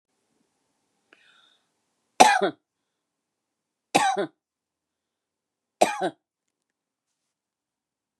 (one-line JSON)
{"three_cough_length": "8.2 s", "three_cough_amplitude": 32768, "three_cough_signal_mean_std_ratio": 0.21, "survey_phase": "beta (2021-08-13 to 2022-03-07)", "age": "65+", "gender": "Female", "wearing_mask": "No", "symptom_none": true, "smoker_status": "Never smoked", "respiratory_condition_asthma": false, "respiratory_condition_other": false, "recruitment_source": "REACT", "submission_delay": "3 days", "covid_test_result": "Negative", "covid_test_method": "RT-qPCR", "influenza_a_test_result": "Negative", "influenza_b_test_result": "Negative"}